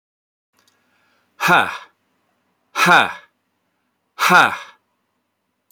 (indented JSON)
{
  "exhalation_length": "5.7 s",
  "exhalation_amplitude": 30796,
  "exhalation_signal_mean_std_ratio": 0.31,
  "survey_phase": "beta (2021-08-13 to 2022-03-07)",
  "age": "45-64",
  "gender": "Male",
  "wearing_mask": "No",
  "symptom_none": true,
  "smoker_status": "Never smoked",
  "respiratory_condition_asthma": false,
  "respiratory_condition_other": false,
  "recruitment_source": "Test and Trace",
  "submission_delay": "0 days",
  "covid_test_result": "Negative",
  "covid_test_method": "LFT"
}